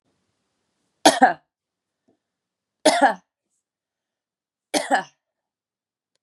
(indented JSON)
{
  "three_cough_length": "6.2 s",
  "three_cough_amplitude": 32767,
  "three_cough_signal_mean_std_ratio": 0.24,
  "survey_phase": "beta (2021-08-13 to 2022-03-07)",
  "age": "45-64",
  "gender": "Female",
  "wearing_mask": "No",
  "symptom_fatigue": true,
  "symptom_other": true,
  "symptom_onset": "3 days",
  "smoker_status": "Never smoked",
  "respiratory_condition_asthma": false,
  "respiratory_condition_other": false,
  "recruitment_source": "Test and Trace",
  "submission_delay": "2 days",
  "covid_test_result": "Positive",
  "covid_test_method": "RT-qPCR",
  "covid_ct_value": 15.5,
  "covid_ct_gene": "N gene",
  "covid_ct_mean": 15.5,
  "covid_viral_load": "8000000 copies/ml",
  "covid_viral_load_category": "High viral load (>1M copies/ml)"
}